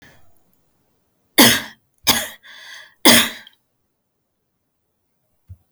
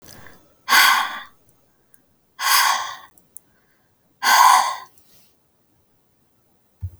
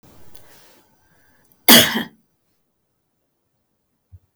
{"three_cough_length": "5.7 s", "three_cough_amplitude": 32768, "three_cough_signal_mean_std_ratio": 0.26, "exhalation_length": "7.0 s", "exhalation_amplitude": 30621, "exhalation_signal_mean_std_ratio": 0.37, "cough_length": "4.4 s", "cough_amplitude": 32768, "cough_signal_mean_std_ratio": 0.21, "survey_phase": "alpha (2021-03-01 to 2021-08-12)", "age": "45-64", "gender": "Female", "wearing_mask": "No", "symptom_none": true, "smoker_status": "Never smoked", "respiratory_condition_asthma": false, "respiratory_condition_other": false, "recruitment_source": "REACT", "submission_delay": "5 days", "covid_test_result": "Negative", "covid_test_method": "RT-qPCR"}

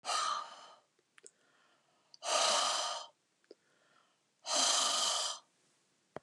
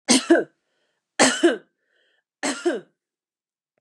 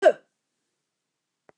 {"exhalation_length": "6.2 s", "exhalation_amplitude": 4500, "exhalation_signal_mean_std_ratio": 0.5, "three_cough_length": "3.8 s", "three_cough_amplitude": 26940, "three_cough_signal_mean_std_ratio": 0.36, "cough_length": "1.6 s", "cough_amplitude": 17008, "cough_signal_mean_std_ratio": 0.18, "survey_phase": "beta (2021-08-13 to 2022-03-07)", "age": "45-64", "gender": "Female", "wearing_mask": "No", "symptom_none": true, "smoker_status": "Never smoked", "respiratory_condition_asthma": false, "respiratory_condition_other": false, "recruitment_source": "REACT", "submission_delay": "1 day", "covid_test_result": "Negative", "covid_test_method": "RT-qPCR", "influenza_a_test_result": "Unknown/Void", "influenza_b_test_result": "Unknown/Void"}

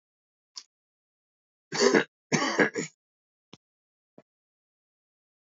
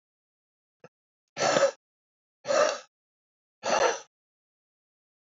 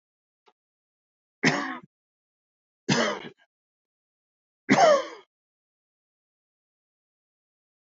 {"cough_length": "5.5 s", "cough_amplitude": 15609, "cough_signal_mean_std_ratio": 0.27, "exhalation_length": "5.4 s", "exhalation_amplitude": 10123, "exhalation_signal_mean_std_ratio": 0.33, "three_cough_length": "7.9 s", "three_cough_amplitude": 15171, "three_cough_signal_mean_std_ratio": 0.26, "survey_phase": "beta (2021-08-13 to 2022-03-07)", "age": "65+", "gender": "Male", "wearing_mask": "No", "symptom_shortness_of_breath": true, "symptom_headache": true, "smoker_status": "Current smoker (1 to 10 cigarettes per day)", "respiratory_condition_asthma": false, "respiratory_condition_other": false, "recruitment_source": "REACT", "submission_delay": "2 days", "covid_test_result": "Negative", "covid_test_method": "RT-qPCR", "influenza_a_test_result": "Negative", "influenza_b_test_result": "Negative"}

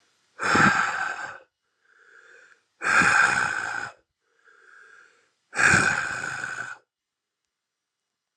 {"exhalation_length": "8.4 s", "exhalation_amplitude": 18145, "exhalation_signal_mean_std_ratio": 0.45, "survey_phase": "alpha (2021-03-01 to 2021-08-12)", "age": "45-64", "gender": "Male", "wearing_mask": "No", "symptom_cough_any": true, "symptom_new_continuous_cough": true, "symptom_shortness_of_breath": true, "symptom_fatigue": true, "symptom_headache": true, "symptom_change_to_sense_of_smell_or_taste": true, "symptom_loss_of_taste": true, "symptom_onset": "3 days", "smoker_status": "Never smoked", "respiratory_condition_asthma": false, "respiratory_condition_other": false, "recruitment_source": "Test and Trace", "submission_delay": "1 day", "covid_test_result": "Positive", "covid_test_method": "RT-qPCR", "covid_ct_value": 23.7, "covid_ct_gene": "ORF1ab gene"}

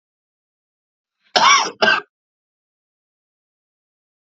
{"cough_length": "4.4 s", "cough_amplitude": 30915, "cough_signal_mean_std_ratio": 0.27, "survey_phase": "alpha (2021-03-01 to 2021-08-12)", "age": "45-64", "gender": "Male", "wearing_mask": "No", "symptom_cough_any": true, "symptom_headache": true, "symptom_onset": "7 days", "smoker_status": "Never smoked", "respiratory_condition_asthma": false, "respiratory_condition_other": false, "recruitment_source": "Test and Trace", "submission_delay": "2 days", "covid_test_result": "Positive", "covid_test_method": "RT-qPCR", "covid_ct_value": 15.3, "covid_ct_gene": "ORF1ab gene", "covid_ct_mean": 15.7, "covid_viral_load": "7300000 copies/ml", "covid_viral_load_category": "High viral load (>1M copies/ml)"}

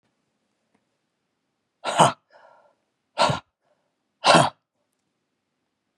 {"exhalation_length": "6.0 s", "exhalation_amplitude": 29599, "exhalation_signal_mean_std_ratio": 0.24, "survey_phase": "beta (2021-08-13 to 2022-03-07)", "age": "45-64", "gender": "Male", "wearing_mask": "No", "symptom_fatigue": true, "symptom_change_to_sense_of_smell_or_taste": true, "symptom_onset": "8 days", "smoker_status": "Ex-smoker", "respiratory_condition_asthma": false, "respiratory_condition_other": false, "recruitment_source": "Test and Trace", "submission_delay": "2 days", "covid_test_result": "Positive", "covid_test_method": "ePCR"}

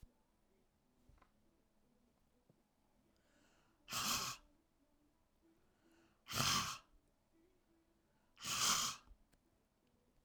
{"exhalation_length": "10.2 s", "exhalation_amplitude": 2944, "exhalation_signal_mean_std_ratio": 0.32, "survey_phase": "beta (2021-08-13 to 2022-03-07)", "age": "45-64", "gender": "Female", "wearing_mask": "No", "symptom_cough_any": true, "symptom_fatigue": true, "symptom_loss_of_taste": true, "smoker_status": "Current smoker (1 to 10 cigarettes per day)", "respiratory_condition_asthma": false, "respiratory_condition_other": false, "recruitment_source": "Test and Trace", "submission_delay": "1 day", "covid_test_result": "Positive", "covid_test_method": "RT-qPCR", "covid_ct_value": 20.6, "covid_ct_gene": "ORF1ab gene"}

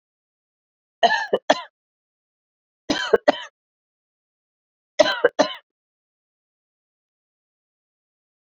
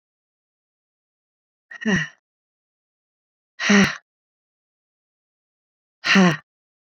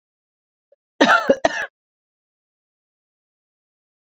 {"three_cough_length": "8.5 s", "three_cough_amplitude": 27792, "three_cough_signal_mean_std_ratio": 0.23, "exhalation_length": "7.0 s", "exhalation_amplitude": 23052, "exhalation_signal_mean_std_ratio": 0.27, "cough_length": "4.1 s", "cough_amplitude": 28193, "cough_signal_mean_std_ratio": 0.24, "survey_phase": "beta (2021-08-13 to 2022-03-07)", "age": "45-64", "gender": "Female", "wearing_mask": "No", "symptom_cough_any": true, "symptom_runny_or_blocked_nose": true, "symptom_sore_throat": true, "symptom_fatigue": true, "symptom_headache": true, "symptom_change_to_sense_of_smell_or_taste": true, "symptom_onset": "2 days", "smoker_status": "Ex-smoker", "respiratory_condition_asthma": false, "respiratory_condition_other": false, "recruitment_source": "Test and Trace", "submission_delay": "2 days", "covid_test_result": "Positive", "covid_test_method": "RT-qPCR", "covid_ct_value": 19.9, "covid_ct_gene": "ORF1ab gene"}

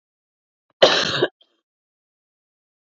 {"cough_length": "2.8 s", "cough_amplitude": 28297, "cough_signal_mean_std_ratio": 0.27, "survey_phase": "beta (2021-08-13 to 2022-03-07)", "age": "18-44", "gender": "Female", "wearing_mask": "No", "symptom_cough_any": true, "symptom_runny_or_blocked_nose": true, "symptom_fatigue": true, "symptom_headache": true, "smoker_status": "Never smoked", "respiratory_condition_asthma": false, "respiratory_condition_other": false, "recruitment_source": "Test and Trace", "submission_delay": "1 day", "covid_test_result": "Positive", "covid_test_method": "RT-qPCR", "covid_ct_value": 30.6, "covid_ct_gene": "ORF1ab gene"}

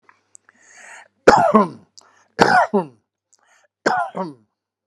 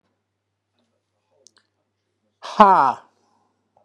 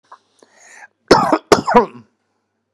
{"three_cough_length": "4.9 s", "three_cough_amplitude": 32768, "three_cough_signal_mean_std_ratio": 0.36, "exhalation_length": "3.8 s", "exhalation_amplitude": 32768, "exhalation_signal_mean_std_ratio": 0.22, "cough_length": "2.7 s", "cough_amplitude": 32768, "cough_signal_mean_std_ratio": 0.33, "survey_phase": "beta (2021-08-13 to 2022-03-07)", "age": "45-64", "gender": "Male", "wearing_mask": "No", "symptom_none": true, "smoker_status": "Ex-smoker", "respiratory_condition_asthma": false, "respiratory_condition_other": false, "recruitment_source": "REACT", "submission_delay": "1 day", "covid_test_result": "Negative", "covid_test_method": "RT-qPCR", "influenza_a_test_result": "Negative", "influenza_b_test_result": "Negative"}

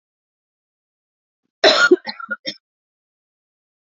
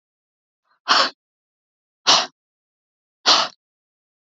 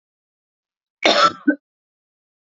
{"three_cough_length": "3.8 s", "three_cough_amplitude": 27944, "three_cough_signal_mean_std_ratio": 0.25, "exhalation_length": "4.3 s", "exhalation_amplitude": 29269, "exhalation_signal_mean_std_ratio": 0.29, "cough_length": "2.6 s", "cough_amplitude": 27425, "cough_signal_mean_std_ratio": 0.29, "survey_phase": "beta (2021-08-13 to 2022-03-07)", "age": "45-64", "gender": "Female", "wearing_mask": "No", "symptom_cough_any": true, "symptom_shortness_of_breath": true, "symptom_sore_throat": true, "symptom_fatigue": true, "symptom_onset": "12 days", "smoker_status": "Never smoked", "respiratory_condition_asthma": false, "respiratory_condition_other": false, "recruitment_source": "REACT", "submission_delay": "1 day", "covid_test_result": "Negative", "covid_test_method": "RT-qPCR", "influenza_a_test_result": "Negative", "influenza_b_test_result": "Negative"}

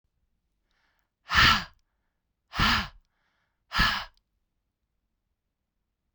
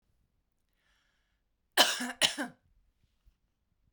{"exhalation_length": "6.1 s", "exhalation_amplitude": 13381, "exhalation_signal_mean_std_ratio": 0.29, "cough_length": "3.9 s", "cough_amplitude": 14032, "cough_signal_mean_std_ratio": 0.24, "survey_phase": "beta (2021-08-13 to 2022-03-07)", "age": "45-64", "gender": "Female", "wearing_mask": "No", "symptom_none": true, "symptom_onset": "7 days", "smoker_status": "Never smoked", "respiratory_condition_asthma": false, "respiratory_condition_other": false, "recruitment_source": "REACT", "submission_delay": "2 days", "covid_test_result": "Negative", "covid_test_method": "RT-qPCR"}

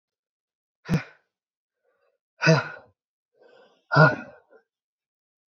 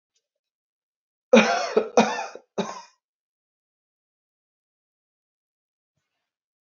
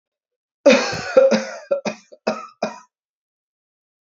{"exhalation_length": "5.5 s", "exhalation_amplitude": 25913, "exhalation_signal_mean_std_ratio": 0.24, "three_cough_length": "6.7 s", "three_cough_amplitude": 23778, "three_cough_signal_mean_std_ratio": 0.24, "cough_length": "4.0 s", "cough_amplitude": 27601, "cough_signal_mean_std_ratio": 0.37, "survey_phase": "alpha (2021-03-01 to 2021-08-12)", "age": "18-44", "gender": "Male", "wearing_mask": "No", "symptom_fatigue": true, "symptom_fever_high_temperature": true, "smoker_status": "Ex-smoker", "respiratory_condition_asthma": true, "respiratory_condition_other": false, "recruitment_source": "Test and Trace", "submission_delay": "1 day", "covid_test_result": "Positive", "covid_test_method": "RT-qPCR"}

